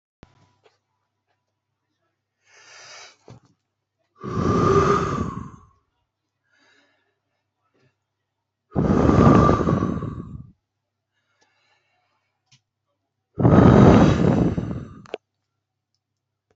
{
  "exhalation_length": "16.6 s",
  "exhalation_amplitude": 29255,
  "exhalation_signal_mean_std_ratio": 0.36,
  "survey_phase": "alpha (2021-03-01 to 2021-08-12)",
  "age": "45-64",
  "gender": "Male",
  "wearing_mask": "No",
  "symptom_none": true,
  "smoker_status": "Never smoked",
  "respiratory_condition_asthma": false,
  "respiratory_condition_other": false,
  "recruitment_source": "REACT",
  "submission_delay": "2 days",
  "covid_test_result": "Negative",
  "covid_test_method": "RT-qPCR"
}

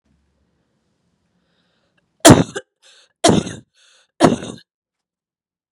{
  "cough_length": "5.7 s",
  "cough_amplitude": 32768,
  "cough_signal_mean_std_ratio": 0.23,
  "survey_phase": "beta (2021-08-13 to 2022-03-07)",
  "age": "18-44",
  "gender": "Female",
  "wearing_mask": "No",
  "symptom_cough_any": true,
  "symptom_runny_or_blocked_nose": true,
  "symptom_headache": true,
  "smoker_status": "Never smoked",
  "respiratory_condition_asthma": false,
  "respiratory_condition_other": false,
  "recruitment_source": "Test and Trace",
  "submission_delay": "2 days",
  "covid_test_result": "Positive",
  "covid_test_method": "RT-qPCR",
  "covid_ct_value": 16.0,
  "covid_ct_gene": "ORF1ab gene",
  "covid_ct_mean": 16.3,
  "covid_viral_load": "4500000 copies/ml",
  "covid_viral_load_category": "High viral load (>1M copies/ml)"
}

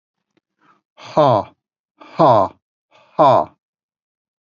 {
  "exhalation_length": "4.4 s",
  "exhalation_amplitude": 28405,
  "exhalation_signal_mean_std_ratio": 0.35,
  "survey_phase": "beta (2021-08-13 to 2022-03-07)",
  "age": "45-64",
  "gender": "Male",
  "wearing_mask": "No",
  "symptom_none": true,
  "smoker_status": "Never smoked",
  "respiratory_condition_asthma": false,
  "respiratory_condition_other": false,
  "recruitment_source": "Test and Trace",
  "submission_delay": "1 day",
  "covid_test_result": "Negative",
  "covid_test_method": "ePCR"
}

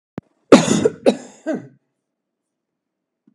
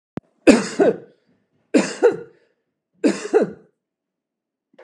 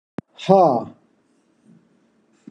{
  "cough_length": "3.3 s",
  "cough_amplitude": 32768,
  "cough_signal_mean_std_ratio": 0.28,
  "three_cough_length": "4.8 s",
  "three_cough_amplitude": 32768,
  "three_cough_signal_mean_std_ratio": 0.34,
  "exhalation_length": "2.5 s",
  "exhalation_amplitude": 30717,
  "exhalation_signal_mean_std_ratio": 0.3,
  "survey_phase": "beta (2021-08-13 to 2022-03-07)",
  "age": "45-64",
  "gender": "Male",
  "wearing_mask": "No",
  "symptom_none": true,
  "symptom_onset": "5 days",
  "smoker_status": "Never smoked",
  "respiratory_condition_asthma": false,
  "respiratory_condition_other": false,
  "recruitment_source": "REACT",
  "submission_delay": "3 days",
  "covid_test_result": "Negative",
  "covid_test_method": "RT-qPCR"
}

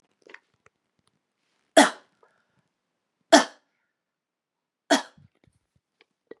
{
  "three_cough_length": "6.4 s",
  "three_cough_amplitude": 29211,
  "three_cough_signal_mean_std_ratio": 0.17,
  "survey_phase": "beta (2021-08-13 to 2022-03-07)",
  "age": "18-44",
  "gender": "Female",
  "wearing_mask": "No",
  "symptom_runny_or_blocked_nose": true,
  "symptom_sore_throat": true,
  "symptom_fatigue": true,
  "symptom_change_to_sense_of_smell_or_taste": true,
  "symptom_onset": "5 days",
  "smoker_status": "Never smoked",
  "respiratory_condition_asthma": false,
  "respiratory_condition_other": false,
  "recruitment_source": "Test and Trace",
  "submission_delay": "2 days",
  "covid_test_result": "Positive",
  "covid_test_method": "RT-qPCR",
  "covid_ct_value": 24.3,
  "covid_ct_gene": "ORF1ab gene",
  "covid_ct_mean": 24.3,
  "covid_viral_load": "11000 copies/ml",
  "covid_viral_load_category": "Low viral load (10K-1M copies/ml)"
}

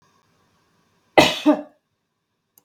{
  "cough_length": "2.6 s",
  "cough_amplitude": 32768,
  "cough_signal_mean_std_ratio": 0.26,
  "survey_phase": "beta (2021-08-13 to 2022-03-07)",
  "age": "45-64",
  "gender": "Female",
  "wearing_mask": "No",
  "symptom_none": true,
  "smoker_status": "Never smoked",
  "respiratory_condition_asthma": false,
  "respiratory_condition_other": false,
  "recruitment_source": "REACT",
  "submission_delay": "2 days",
  "covid_test_result": "Negative",
  "covid_test_method": "RT-qPCR"
}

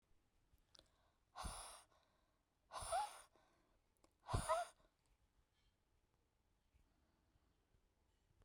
{
  "exhalation_length": "8.4 s",
  "exhalation_amplitude": 1233,
  "exhalation_signal_mean_std_ratio": 0.29,
  "survey_phase": "beta (2021-08-13 to 2022-03-07)",
  "age": "45-64",
  "gender": "Female",
  "wearing_mask": "No",
  "symptom_fatigue": true,
  "symptom_headache": true,
  "symptom_onset": "12 days",
  "smoker_status": "Never smoked",
  "respiratory_condition_asthma": true,
  "respiratory_condition_other": false,
  "recruitment_source": "REACT",
  "submission_delay": "1 day",
  "covid_test_result": "Negative",
  "covid_test_method": "RT-qPCR"
}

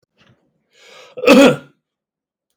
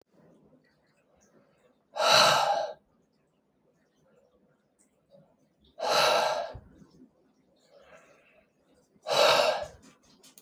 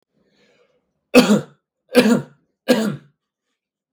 {
  "cough_length": "2.6 s",
  "cough_amplitude": 32768,
  "cough_signal_mean_std_ratio": 0.3,
  "exhalation_length": "10.4 s",
  "exhalation_amplitude": 14258,
  "exhalation_signal_mean_std_ratio": 0.36,
  "three_cough_length": "3.9 s",
  "three_cough_amplitude": 32768,
  "three_cough_signal_mean_std_ratio": 0.34,
  "survey_phase": "beta (2021-08-13 to 2022-03-07)",
  "age": "18-44",
  "gender": "Male",
  "wearing_mask": "No",
  "symptom_none": true,
  "smoker_status": "Ex-smoker",
  "respiratory_condition_asthma": false,
  "respiratory_condition_other": false,
  "recruitment_source": "REACT",
  "submission_delay": "0 days",
  "covid_test_result": "Negative",
  "covid_test_method": "RT-qPCR",
  "influenza_a_test_result": "Unknown/Void",
  "influenza_b_test_result": "Unknown/Void"
}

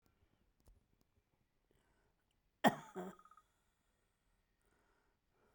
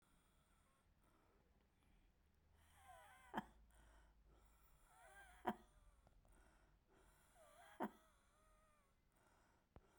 {
  "cough_length": "5.5 s",
  "cough_amplitude": 4375,
  "cough_signal_mean_std_ratio": 0.14,
  "exhalation_length": "10.0 s",
  "exhalation_amplitude": 1219,
  "exhalation_signal_mean_std_ratio": 0.32,
  "survey_phase": "beta (2021-08-13 to 2022-03-07)",
  "age": "65+",
  "gender": "Female",
  "wearing_mask": "No",
  "symptom_shortness_of_breath": true,
  "symptom_change_to_sense_of_smell_or_taste": true,
  "symptom_onset": "12 days",
  "smoker_status": "Ex-smoker",
  "respiratory_condition_asthma": true,
  "respiratory_condition_other": true,
  "recruitment_source": "REACT",
  "submission_delay": "0 days",
  "covid_test_result": "Negative",
  "covid_test_method": "RT-qPCR"
}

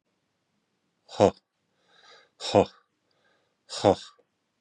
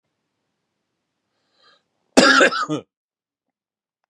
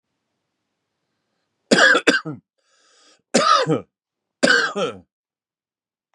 {
  "exhalation_length": "4.6 s",
  "exhalation_amplitude": 18438,
  "exhalation_signal_mean_std_ratio": 0.21,
  "cough_length": "4.1 s",
  "cough_amplitude": 32767,
  "cough_signal_mean_std_ratio": 0.27,
  "three_cough_length": "6.1 s",
  "three_cough_amplitude": 32767,
  "three_cough_signal_mean_std_ratio": 0.36,
  "survey_phase": "beta (2021-08-13 to 2022-03-07)",
  "age": "45-64",
  "gender": "Male",
  "wearing_mask": "No",
  "symptom_sore_throat": true,
  "symptom_fatigue": true,
  "symptom_headache": true,
  "smoker_status": "Never smoked",
  "respiratory_condition_asthma": false,
  "respiratory_condition_other": false,
  "recruitment_source": "REACT",
  "submission_delay": "2 days",
  "covid_test_result": "Negative",
  "covid_test_method": "RT-qPCR",
  "influenza_a_test_result": "Negative",
  "influenza_b_test_result": "Negative"
}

